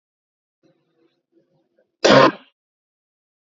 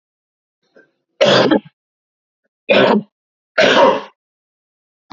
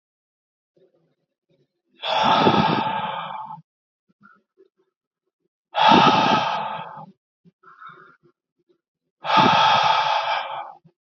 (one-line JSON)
{"cough_length": "3.5 s", "cough_amplitude": 32767, "cough_signal_mean_std_ratio": 0.23, "three_cough_length": "5.1 s", "three_cough_amplitude": 30563, "three_cough_signal_mean_std_ratio": 0.4, "exhalation_length": "11.0 s", "exhalation_amplitude": 27816, "exhalation_signal_mean_std_ratio": 0.47, "survey_phase": "beta (2021-08-13 to 2022-03-07)", "age": "18-44", "gender": "Male", "wearing_mask": "No", "symptom_sore_throat": true, "symptom_fatigue": true, "symptom_fever_high_temperature": true, "symptom_headache": true, "symptom_other": true, "symptom_onset": "10 days", "smoker_status": "Never smoked", "respiratory_condition_asthma": true, "respiratory_condition_other": false, "recruitment_source": "Test and Trace", "submission_delay": "5 days", "covid_test_result": "Negative", "covid_test_method": "RT-qPCR"}